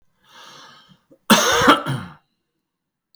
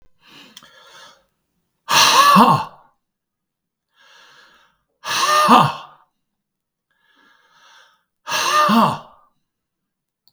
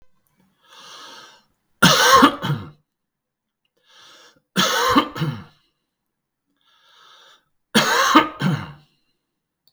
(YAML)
cough_length: 3.2 s
cough_amplitude: 32768
cough_signal_mean_std_ratio: 0.35
exhalation_length: 10.3 s
exhalation_amplitude: 32768
exhalation_signal_mean_std_ratio: 0.37
three_cough_length: 9.7 s
three_cough_amplitude: 32768
three_cough_signal_mean_std_ratio: 0.36
survey_phase: beta (2021-08-13 to 2022-03-07)
age: 65+
gender: Male
wearing_mask: 'No'
symptom_cough_any: true
symptom_sore_throat: true
symptom_fatigue: true
symptom_headache: true
symptom_onset: 12 days
smoker_status: Ex-smoker
respiratory_condition_asthma: false
respiratory_condition_other: false
recruitment_source: REACT
submission_delay: 3 days
covid_test_result: Negative
covid_test_method: RT-qPCR
influenza_a_test_result: Negative
influenza_b_test_result: Negative